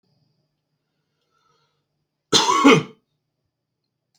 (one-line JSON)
{"cough_length": "4.2 s", "cough_amplitude": 30018, "cough_signal_mean_std_ratio": 0.26, "survey_phase": "beta (2021-08-13 to 2022-03-07)", "age": "18-44", "gender": "Male", "wearing_mask": "No", "symptom_none": true, "smoker_status": "Never smoked", "respiratory_condition_asthma": false, "respiratory_condition_other": false, "recruitment_source": "REACT", "submission_delay": "2 days", "covid_test_result": "Negative", "covid_test_method": "RT-qPCR"}